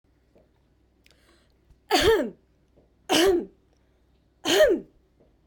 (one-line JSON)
{"three_cough_length": "5.5 s", "three_cough_amplitude": 15377, "three_cough_signal_mean_std_ratio": 0.38, "survey_phase": "beta (2021-08-13 to 2022-03-07)", "age": "45-64", "gender": "Female", "wearing_mask": "No", "symptom_none": true, "smoker_status": "Never smoked", "respiratory_condition_asthma": false, "respiratory_condition_other": false, "recruitment_source": "REACT", "submission_delay": "3 days", "covid_test_result": "Negative", "covid_test_method": "RT-qPCR"}